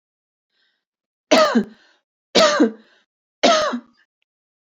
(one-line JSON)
{"three_cough_length": "4.8 s", "three_cough_amplitude": 29980, "three_cough_signal_mean_std_ratio": 0.37, "survey_phase": "beta (2021-08-13 to 2022-03-07)", "age": "45-64", "gender": "Female", "wearing_mask": "No", "symptom_cough_any": true, "symptom_shortness_of_breath": true, "symptom_sore_throat": true, "symptom_fatigue": true, "symptom_change_to_sense_of_smell_or_taste": true, "symptom_loss_of_taste": true, "smoker_status": "Never smoked", "respiratory_condition_asthma": false, "respiratory_condition_other": false, "recruitment_source": "Test and Trace", "submission_delay": "2 days", "covid_test_result": "Positive", "covid_test_method": "LFT"}